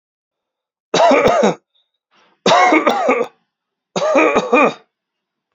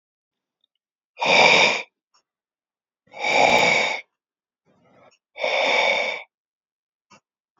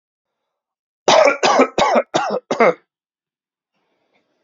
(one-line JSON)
{"three_cough_length": "5.5 s", "three_cough_amplitude": 31621, "three_cough_signal_mean_std_ratio": 0.53, "exhalation_length": "7.6 s", "exhalation_amplitude": 26970, "exhalation_signal_mean_std_ratio": 0.43, "cough_length": "4.4 s", "cough_amplitude": 28100, "cough_signal_mean_std_ratio": 0.42, "survey_phase": "beta (2021-08-13 to 2022-03-07)", "age": "18-44", "gender": "Male", "wearing_mask": "No", "symptom_runny_or_blocked_nose": true, "smoker_status": "Ex-smoker", "respiratory_condition_asthma": false, "respiratory_condition_other": false, "recruitment_source": "REACT", "submission_delay": "1 day", "covid_test_result": "Negative", "covid_test_method": "RT-qPCR"}